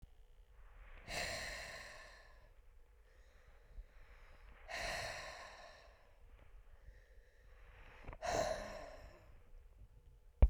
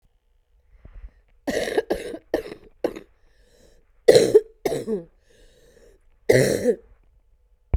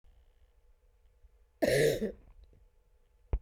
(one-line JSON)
{"exhalation_length": "10.5 s", "exhalation_amplitude": 5524, "exhalation_signal_mean_std_ratio": 0.36, "three_cough_length": "7.8 s", "three_cough_amplitude": 32768, "three_cough_signal_mean_std_ratio": 0.33, "cough_length": "3.4 s", "cough_amplitude": 5550, "cough_signal_mean_std_ratio": 0.34, "survey_phase": "beta (2021-08-13 to 2022-03-07)", "age": "18-44", "gender": "Female", "wearing_mask": "No", "symptom_cough_any": true, "symptom_runny_or_blocked_nose": true, "symptom_sore_throat": true, "symptom_diarrhoea": true, "symptom_fatigue": true, "symptom_headache": true, "symptom_onset": "8 days", "smoker_status": "Current smoker (1 to 10 cigarettes per day)", "respiratory_condition_asthma": false, "respiratory_condition_other": false, "recruitment_source": "REACT", "submission_delay": "3 days", "covid_test_result": "Negative", "covid_test_method": "RT-qPCR", "influenza_a_test_result": "Negative", "influenza_b_test_result": "Negative"}